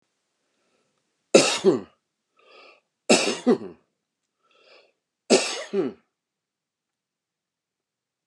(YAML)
three_cough_length: 8.3 s
three_cough_amplitude: 28629
three_cough_signal_mean_std_ratio: 0.28
survey_phase: beta (2021-08-13 to 2022-03-07)
age: 65+
gender: Male
wearing_mask: 'No'
symptom_none: true
smoker_status: Ex-smoker
respiratory_condition_asthma: false
respiratory_condition_other: false
recruitment_source: REACT
submission_delay: 1 day
covid_test_result: Negative
covid_test_method: RT-qPCR
influenza_a_test_result: Negative
influenza_b_test_result: Negative